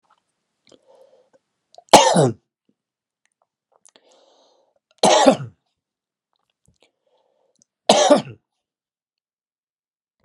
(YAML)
three_cough_length: 10.2 s
three_cough_amplitude: 32768
three_cough_signal_mean_std_ratio: 0.24
survey_phase: beta (2021-08-13 to 2022-03-07)
age: 45-64
gender: Male
wearing_mask: 'No'
symptom_runny_or_blocked_nose: true
symptom_headache: true
smoker_status: Never smoked
respiratory_condition_asthma: false
respiratory_condition_other: false
recruitment_source: Test and Trace
submission_delay: 1 day
covid_test_result: Positive
covid_test_method: LFT